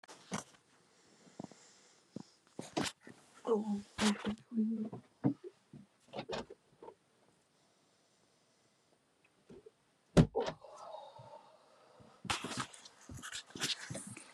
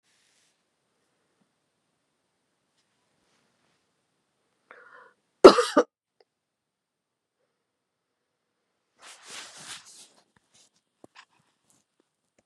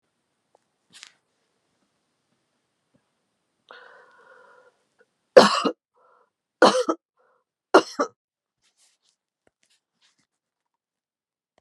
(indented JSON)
{
  "exhalation_length": "14.3 s",
  "exhalation_amplitude": 8699,
  "exhalation_signal_mean_std_ratio": 0.35,
  "cough_length": "12.5 s",
  "cough_amplitude": 32768,
  "cough_signal_mean_std_ratio": 0.1,
  "three_cough_length": "11.6 s",
  "three_cough_amplitude": 32768,
  "three_cough_signal_mean_std_ratio": 0.17,
  "survey_phase": "beta (2021-08-13 to 2022-03-07)",
  "age": "45-64",
  "gender": "Female",
  "wearing_mask": "Yes",
  "symptom_none": true,
  "smoker_status": "Never smoked",
  "respiratory_condition_asthma": false,
  "respiratory_condition_other": false,
  "recruitment_source": "REACT",
  "submission_delay": "3 days",
  "covid_test_result": "Negative",
  "covid_test_method": "RT-qPCR",
  "influenza_a_test_result": "Negative",
  "influenza_b_test_result": "Negative"
}